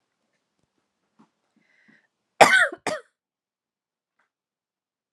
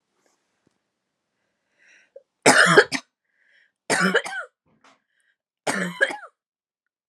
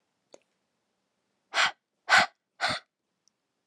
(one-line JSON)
{"cough_length": "5.1 s", "cough_amplitude": 32767, "cough_signal_mean_std_ratio": 0.19, "three_cough_length": "7.1 s", "three_cough_amplitude": 32557, "three_cough_signal_mean_std_ratio": 0.29, "exhalation_length": "3.7 s", "exhalation_amplitude": 16565, "exhalation_signal_mean_std_ratio": 0.27, "survey_phase": "alpha (2021-03-01 to 2021-08-12)", "age": "18-44", "gender": "Female", "wearing_mask": "No", "symptom_headache": true, "symptom_onset": "12 days", "smoker_status": "Never smoked", "respiratory_condition_asthma": false, "respiratory_condition_other": false, "recruitment_source": "REACT", "submission_delay": "2 days", "covid_test_result": "Negative", "covid_test_method": "RT-qPCR"}